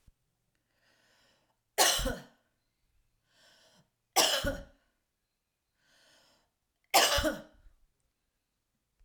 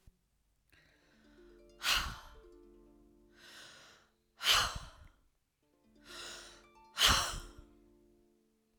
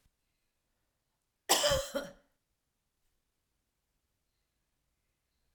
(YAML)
three_cough_length: 9.0 s
three_cough_amplitude: 11511
three_cough_signal_mean_std_ratio: 0.28
exhalation_length: 8.8 s
exhalation_amplitude: 6906
exhalation_signal_mean_std_ratio: 0.31
cough_length: 5.5 s
cough_amplitude: 11779
cough_signal_mean_std_ratio: 0.22
survey_phase: alpha (2021-03-01 to 2021-08-12)
age: 45-64
gender: Female
wearing_mask: 'No'
symptom_none: true
smoker_status: Never smoked
respiratory_condition_asthma: false
respiratory_condition_other: false
recruitment_source: REACT
submission_delay: 2 days
covid_test_result: Negative
covid_test_method: RT-qPCR